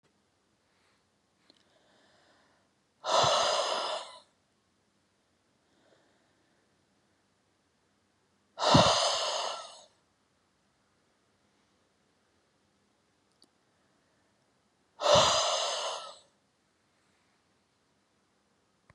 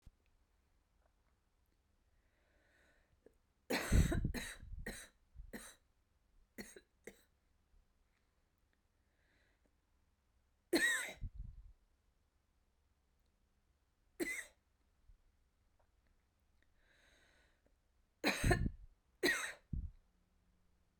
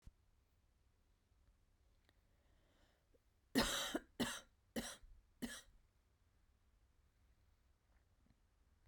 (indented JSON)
{
  "exhalation_length": "18.9 s",
  "exhalation_amplitude": 12712,
  "exhalation_signal_mean_std_ratio": 0.3,
  "three_cough_length": "21.0 s",
  "three_cough_amplitude": 4484,
  "three_cough_signal_mean_std_ratio": 0.28,
  "cough_length": "8.9 s",
  "cough_amplitude": 2250,
  "cough_signal_mean_std_ratio": 0.28,
  "survey_phase": "beta (2021-08-13 to 2022-03-07)",
  "age": "18-44",
  "gender": "Female",
  "wearing_mask": "No",
  "symptom_cough_any": true,
  "symptom_runny_or_blocked_nose": true,
  "symptom_diarrhoea": true,
  "symptom_headache": true,
  "symptom_change_to_sense_of_smell_or_taste": true,
  "symptom_onset": "3 days",
  "smoker_status": "Never smoked",
  "respiratory_condition_asthma": false,
  "respiratory_condition_other": false,
  "recruitment_source": "Test and Trace",
  "submission_delay": "1 day",
  "covid_test_result": "Positive",
  "covid_test_method": "RT-qPCR",
  "covid_ct_value": 15.5,
  "covid_ct_gene": "ORF1ab gene",
  "covid_ct_mean": 15.6,
  "covid_viral_load": "7900000 copies/ml",
  "covid_viral_load_category": "High viral load (>1M copies/ml)"
}